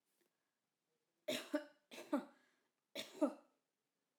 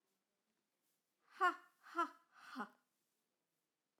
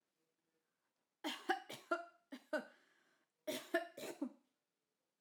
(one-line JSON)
{"three_cough_length": "4.2 s", "three_cough_amplitude": 2241, "three_cough_signal_mean_std_ratio": 0.29, "exhalation_length": "4.0 s", "exhalation_amplitude": 1939, "exhalation_signal_mean_std_ratio": 0.24, "cough_length": "5.2 s", "cough_amplitude": 2198, "cough_signal_mean_std_ratio": 0.35, "survey_phase": "alpha (2021-03-01 to 2021-08-12)", "age": "18-44", "gender": "Female", "wearing_mask": "No", "symptom_none": true, "smoker_status": "Never smoked", "respiratory_condition_asthma": false, "respiratory_condition_other": false, "recruitment_source": "REACT", "submission_delay": "1 day", "covid_test_result": "Negative", "covid_test_method": "RT-qPCR"}